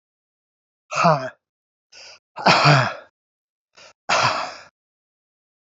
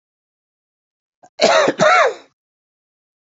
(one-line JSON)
{"exhalation_length": "5.7 s", "exhalation_amplitude": 28756, "exhalation_signal_mean_std_ratio": 0.35, "cough_length": "3.2 s", "cough_amplitude": 32768, "cough_signal_mean_std_ratio": 0.38, "survey_phase": "alpha (2021-03-01 to 2021-08-12)", "age": "45-64", "gender": "Male", "wearing_mask": "No", "symptom_cough_any": true, "symptom_fatigue": true, "symptom_fever_high_temperature": true, "symptom_headache": true, "symptom_onset": "4 days", "smoker_status": "Never smoked", "respiratory_condition_asthma": false, "respiratory_condition_other": false, "recruitment_source": "Test and Trace", "submission_delay": "1 day", "covid_test_result": "Positive", "covid_test_method": "RT-qPCR"}